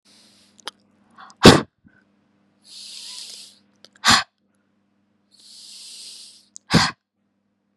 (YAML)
exhalation_length: 7.8 s
exhalation_amplitude: 32768
exhalation_signal_mean_std_ratio: 0.21
survey_phase: beta (2021-08-13 to 2022-03-07)
age: 18-44
gender: Female
wearing_mask: 'No'
symptom_runny_or_blocked_nose: true
symptom_sore_throat: true
symptom_fatigue: true
smoker_status: Ex-smoker
respiratory_condition_asthma: false
respiratory_condition_other: false
recruitment_source: Test and Trace
submission_delay: 1 day
covid_test_result: Negative
covid_test_method: RT-qPCR